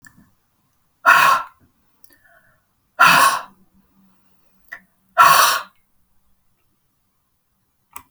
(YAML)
exhalation_length: 8.1 s
exhalation_amplitude: 32768
exhalation_signal_mean_std_ratio: 0.31
survey_phase: beta (2021-08-13 to 2022-03-07)
age: 65+
gender: Female
wearing_mask: 'No'
symptom_none: true
smoker_status: Ex-smoker
respiratory_condition_asthma: false
respiratory_condition_other: false
recruitment_source: REACT
submission_delay: 2 days
covid_test_result: Negative
covid_test_method: RT-qPCR
influenza_a_test_result: Negative
influenza_b_test_result: Negative